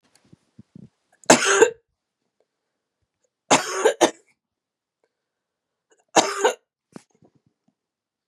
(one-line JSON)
{"three_cough_length": "8.3 s", "three_cough_amplitude": 32767, "three_cough_signal_mean_std_ratio": 0.26, "survey_phase": "beta (2021-08-13 to 2022-03-07)", "age": "45-64", "gender": "Female", "wearing_mask": "No", "symptom_cough_any": true, "symptom_runny_or_blocked_nose": true, "symptom_fatigue": true, "smoker_status": "Ex-smoker", "respiratory_condition_asthma": true, "respiratory_condition_other": false, "recruitment_source": "Test and Trace", "submission_delay": "-1 day", "covid_test_result": "Positive", "covid_test_method": "LFT"}